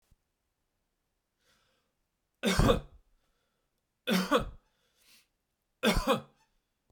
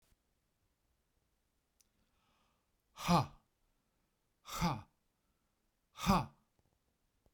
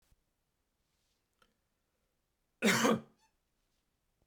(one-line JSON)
{"three_cough_length": "6.9 s", "three_cough_amplitude": 9591, "three_cough_signal_mean_std_ratio": 0.31, "exhalation_length": "7.3 s", "exhalation_amplitude": 3854, "exhalation_signal_mean_std_ratio": 0.24, "cough_length": "4.3 s", "cough_amplitude": 5300, "cough_signal_mean_std_ratio": 0.24, "survey_phase": "beta (2021-08-13 to 2022-03-07)", "age": "45-64", "gender": "Male", "wearing_mask": "No", "symptom_none": true, "smoker_status": "Ex-smoker", "respiratory_condition_asthma": false, "respiratory_condition_other": false, "recruitment_source": "REACT", "submission_delay": "2 days", "covid_test_result": "Negative", "covid_test_method": "RT-qPCR", "influenza_a_test_result": "Negative", "influenza_b_test_result": "Negative"}